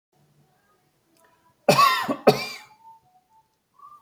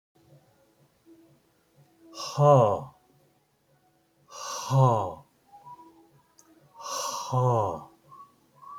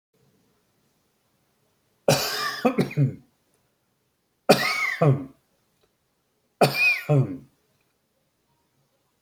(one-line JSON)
{"cough_length": "4.0 s", "cough_amplitude": 25880, "cough_signal_mean_std_ratio": 0.3, "exhalation_length": "8.8 s", "exhalation_amplitude": 15719, "exhalation_signal_mean_std_ratio": 0.36, "three_cough_length": "9.2 s", "three_cough_amplitude": 25868, "three_cough_signal_mean_std_ratio": 0.36, "survey_phase": "beta (2021-08-13 to 2022-03-07)", "age": "45-64", "gender": "Male", "wearing_mask": "No", "symptom_none": true, "smoker_status": "Never smoked", "respiratory_condition_asthma": false, "respiratory_condition_other": false, "recruitment_source": "REACT", "submission_delay": "1 day", "covid_test_result": "Negative", "covid_test_method": "RT-qPCR"}